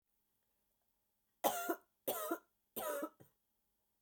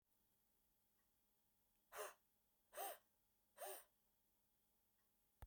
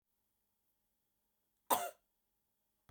{"three_cough_length": "4.0 s", "three_cough_amplitude": 3398, "three_cough_signal_mean_std_ratio": 0.37, "exhalation_length": "5.5 s", "exhalation_amplitude": 395, "exhalation_signal_mean_std_ratio": 0.33, "cough_length": "2.9 s", "cough_amplitude": 5690, "cough_signal_mean_std_ratio": 0.18, "survey_phase": "beta (2021-08-13 to 2022-03-07)", "age": "45-64", "gender": "Female", "wearing_mask": "No", "symptom_cough_any": true, "symptom_runny_or_blocked_nose": true, "symptom_headache": true, "symptom_onset": "2 days", "smoker_status": "Never smoked", "respiratory_condition_asthma": false, "respiratory_condition_other": false, "recruitment_source": "Test and Trace", "submission_delay": "2 days", "covid_test_result": "Positive", "covid_test_method": "RT-qPCR"}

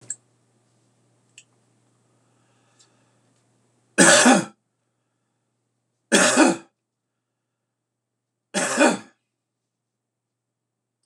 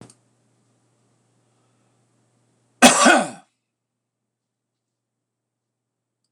{"three_cough_length": "11.1 s", "three_cough_amplitude": 26028, "three_cough_signal_mean_std_ratio": 0.26, "cough_length": "6.3 s", "cough_amplitude": 26028, "cough_signal_mean_std_ratio": 0.2, "survey_phase": "beta (2021-08-13 to 2022-03-07)", "age": "45-64", "gender": "Male", "wearing_mask": "No", "symptom_none": true, "smoker_status": "Never smoked", "respiratory_condition_asthma": false, "respiratory_condition_other": false, "recruitment_source": "REACT", "submission_delay": "1 day", "covid_test_result": "Negative", "covid_test_method": "RT-qPCR", "influenza_a_test_result": "Negative", "influenza_b_test_result": "Negative"}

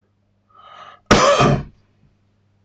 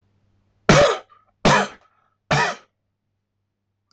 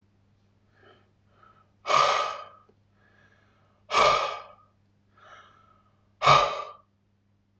{"cough_length": "2.6 s", "cough_amplitude": 26028, "cough_signal_mean_std_ratio": 0.39, "three_cough_length": "3.9 s", "three_cough_amplitude": 24970, "three_cough_signal_mean_std_ratio": 0.36, "exhalation_length": "7.6 s", "exhalation_amplitude": 15170, "exhalation_signal_mean_std_ratio": 0.33, "survey_phase": "beta (2021-08-13 to 2022-03-07)", "age": "18-44", "gender": "Male", "wearing_mask": "No", "symptom_none": true, "smoker_status": "Never smoked", "respiratory_condition_asthma": false, "respiratory_condition_other": false, "recruitment_source": "REACT", "submission_delay": "1 day", "covid_test_result": "Negative", "covid_test_method": "RT-qPCR", "influenza_a_test_result": "Negative", "influenza_b_test_result": "Negative"}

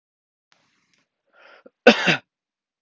{"cough_length": "2.8 s", "cough_amplitude": 32768, "cough_signal_mean_std_ratio": 0.21, "survey_phase": "alpha (2021-03-01 to 2021-08-12)", "age": "18-44", "gender": "Male", "wearing_mask": "No", "symptom_cough_any": true, "symptom_diarrhoea": true, "symptom_fatigue": true, "symptom_fever_high_temperature": true, "symptom_headache": true, "symptom_change_to_sense_of_smell_or_taste": true, "symptom_loss_of_taste": true, "smoker_status": "Never smoked", "respiratory_condition_asthma": false, "respiratory_condition_other": false, "recruitment_source": "Test and Trace", "submission_delay": "2 days", "covid_test_result": "Positive", "covid_test_method": "RT-qPCR", "covid_ct_value": 26.0, "covid_ct_gene": "ORF1ab gene", "covid_ct_mean": 26.4, "covid_viral_load": "2100 copies/ml", "covid_viral_load_category": "Minimal viral load (< 10K copies/ml)"}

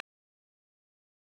{"three_cough_length": "1.2 s", "three_cough_amplitude": 2139, "three_cough_signal_mean_std_ratio": 0.04, "survey_phase": "alpha (2021-03-01 to 2021-08-12)", "age": "65+", "gender": "Female", "wearing_mask": "No", "symptom_none": true, "smoker_status": "Ex-smoker", "respiratory_condition_asthma": false, "respiratory_condition_other": false, "recruitment_source": "REACT", "submission_delay": "4 days", "covid_test_result": "Negative", "covid_test_method": "RT-qPCR"}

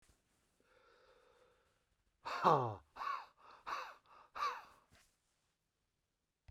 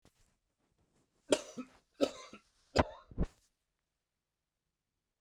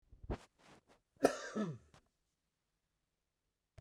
{"exhalation_length": "6.5 s", "exhalation_amplitude": 5852, "exhalation_signal_mean_std_ratio": 0.29, "three_cough_length": "5.2 s", "three_cough_amplitude": 9062, "three_cough_signal_mean_std_ratio": 0.21, "cough_length": "3.8 s", "cough_amplitude": 6583, "cough_signal_mean_std_ratio": 0.25, "survey_phase": "beta (2021-08-13 to 2022-03-07)", "age": "65+", "gender": "Male", "wearing_mask": "No", "symptom_none": true, "smoker_status": "Never smoked", "respiratory_condition_asthma": false, "respiratory_condition_other": false, "recruitment_source": "REACT", "submission_delay": "1 day", "covid_test_result": "Negative", "covid_test_method": "RT-qPCR", "influenza_a_test_result": "Negative", "influenza_b_test_result": "Negative"}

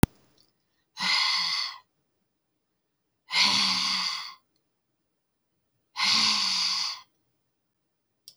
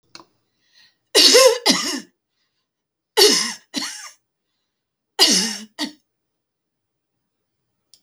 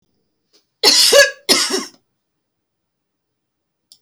{"exhalation_length": "8.4 s", "exhalation_amplitude": 22324, "exhalation_signal_mean_std_ratio": 0.46, "three_cough_length": "8.0 s", "three_cough_amplitude": 32768, "three_cough_signal_mean_std_ratio": 0.34, "cough_length": "4.0 s", "cough_amplitude": 32768, "cough_signal_mean_std_ratio": 0.35, "survey_phase": "alpha (2021-03-01 to 2021-08-12)", "age": "45-64", "gender": "Female", "wearing_mask": "No", "symptom_none": true, "smoker_status": "Ex-smoker", "respiratory_condition_asthma": false, "respiratory_condition_other": false, "recruitment_source": "REACT", "submission_delay": "1 day", "covid_test_result": "Negative", "covid_test_method": "RT-qPCR"}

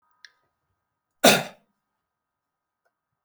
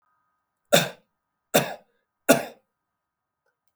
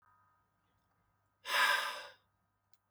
{"cough_length": "3.2 s", "cough_amplitude": 26519, "cough_signal_mean_std_ratio": 0.18, "three_cough_length": "3.8 s", "three_cough_amplitude": 27844, "three_cough_signal_mean_std_ratio": 0.24, "exhalation_length": "2.9 s", "exhalation_amplitude": 4103, "exhalation_signal_mean_std_ratio": 0.33, "survey_phase": "beta (2021-08-13 to 2022-03-07)", "age": "45-64", "gender": "Male", "wearing_mask": "No", "symptom_none": true, "smoker_status": "Never smoked", "respiratory_condition_asthma": false, "respiratory_condition_other": false, "recruitment_source": "REACT", "submission_delay": "1 day", "covid_test_result": "Negative", "covid_test_method": "RT-qPCR"}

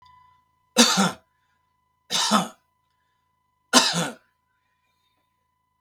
{"three_cough_length": "5.8 s", "three_cough_amplitude": 31894, "three_cough_signal_mean_std_ratio": 0.32, "survey_phase": "beta (2021-08-13 to 2022-03-07)", "age": "45-64", "gender": "Male", "wearing_mask": "No", "symptom_fatigue": true, "smoker_status": "Never smoked", "respiratory_condition_asthma": false, "respiratory_condition_other": false, "recruitment_source": "REACT", "submission_delay": "1 day", "covid_test_result": "Negative", "covid_test_method": "RT-qPCR", "influenza_a_test_result": "Negative", "influenza_b_test_result": "Negative"}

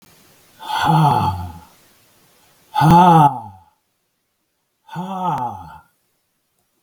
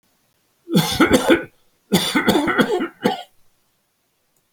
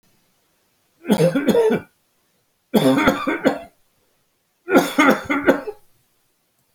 {"exhalation_length": "6.8 s", "exhalation_amplitude": 28045, "exhalation_signal_mean_std_ratio": 0.41, "cough_length": "4.5 s", "cough_amplitude": 30668, "cough_signal_mean_std_ratio": 0.49, "three_cough_length": "6.7 s", "three_cough_amplitude": 30243, "three_cough_signal_mean_std_ratio": 0.46, "survey_phase": "alpha (2021-03-01 to 2021-08-12)", "age": "65+", "gender": "Male", "wearing_mask": "No", "symptom_none": true, "smoker_status": "Never smoked", "respiratory_condition_asthma": false, "respiratory_condition_other": false, "recruitment_source": "REACT", "submission_delay": "1 day", "covid_test_result": "Negative", "covid_test_method": "RT-qPCR"}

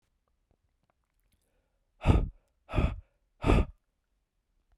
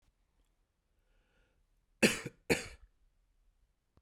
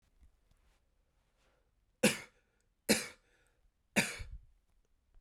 {"exhalation_length": "4.8 s", "exhalation_amplitude": 13068, "exhalation_signal_mean_std_ratio": 0.29, "cough_length": "4.0 s", "cough_amplitude": 7924, "cough_signal_mean_std_ratio": 0.2, "three_cough_length": "5.2 s", "three_cough_amplitude": 7192, "three_cough_signal_mean_std_ratio": 0.23, "survey_phase": "beta (2021-08-13 to 2022-03-07)", "age": "18-44", "gender": "Male", "wearing_mask": "No", "symptom_cough_any": true, "symptom_runny_or_blocked_nose": true, "symptom_sore_throat": true, "symptom_abdominal_pain": true, "symptom_fatigue": true, "symptom_fever_high_temperature": true, "symptom_headache": true, "smoker_status": "Never smoked", "respiratory_condition_asthma": false, "respiratory_condition_other": false, "recruitment_source": "Test and Trace", "submission_delay": "2 days", "covid_test_result": "Positive", "covid_test_method": "RT-qPCR", "covid_ct_value": 19.1, "covid_ct_gene": "N gene"}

